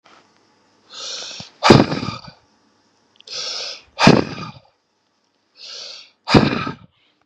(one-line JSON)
{"exhalation_length": "7.3 s", "exhalation_amplitude": 32768, "exhalation_signal_mean_std_ratio": 0.32, "survey_phase": "beta (2021-08-13 to 2022-03-07)", "age": "18-44", "gender": "Male", "wearing_mask": "No", "symptom_none": true, "smoker_status": "Ex-smoker", "respiratory_condition_asthma": false, "respiratory_condition_other": false, "recruitment_source": "REACT", "submission_delay": "3 days", "covid_test_result": "Negative", "covid_test_method": "RT-qPCR", "influenza_a_test_result": "Negative", "influenza_b_test_result": "Negative"}